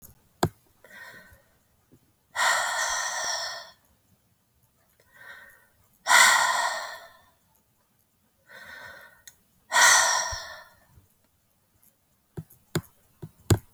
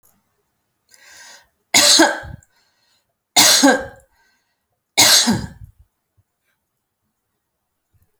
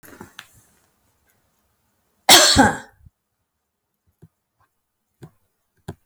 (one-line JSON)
{"exhalation_length": "13.7 s", "exhalation_amplitude": 21798, "exhalation_signal_mean_std_ratio": 0.35, "three_cough_length": "8.2 s", "three_cough_amplitude": 32768, "three_cough_signal_mean_std_ratio": 0.33, "cough_length": "6.1 s", "cough_amplitude": 32768, "cough_signal_mean_std_ratio": 0.22, "survey_phase": "beta (2021-08-13 to 2022-03-07)", "age": "45-64", "gender": "Female", "wearing_mask": "No", "symptom_none": true, "smoker_status": "Never smoked", "respiratory_condition_asthma": false, "respiratory_condition_other": false, "recruitment_source": "REACT", "submission_delay": "3 days", "covid_test_result": "Negative", "covid_test_method": "RT-qPCR"}